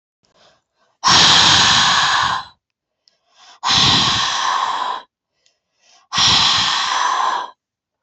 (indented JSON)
{
  "exhalation_length": "8.0 s",
  "exhalation_amplitude": 32683,
  "exhalation_signal_mean_std_ratio": 0.63,
  "survey_phase": "beta (2021-08-13 to 2022-03-07)",
  "age": "18-44",
  "gender": "Female",
  "wearing_mask": "No",
  "symptom_runny_or_blocked_nose": true,
  "symptom_headache": true,
  "symptom_change_to_sense_of_smell_or_taste": true,
  "symptom_loss_of_taste": true,
  "symptom_onset": "3 days",
  "smoker_status": "Never smoked",
  "respiratory_condition_asthma": false,
  "respiratory_condition_other": false,
  "recruitment_source": "Test and Trace",
  "submission_delay": "1 day",
  "covid_test_result": "Positive",
  "covid_test_method": "RT-qPCR",
  "covid_ct_value": 26.8,
  "covid_ct_gene": "ORF1ab gene"
}